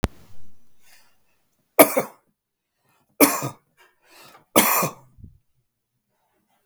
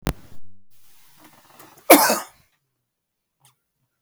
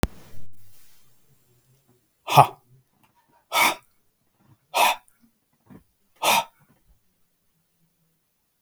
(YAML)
three_cough_length: 6.7 s
three_cough_amplitude: 32767
three_cough_signal_mean_std_ratio: 0.27
cough_length: 4.0 s
cough_amplitude: 32768
cough_signal_mean_std_ratio: 0.26
exhalation_length: 8.6 s
exhalation_amplitude: 32768
exhalation_signal_mean_std_ratio: 0.27
survey_phase: beta (2021-08-13 to 2022-03-07)
age: 65+
gender: Male
wearing_mask: 'No'
symptom_none: true
smoker_status: Never smoked
respiratory_condition_asthma: false
respiratory_condition_other: false
recruitment_source: REACT
submission_delay: 1 day
covid_test_result: Negative
covid_test_method: RT-qPCR
influenza_a_test_result: Negative
influenza_b_test_result: Negative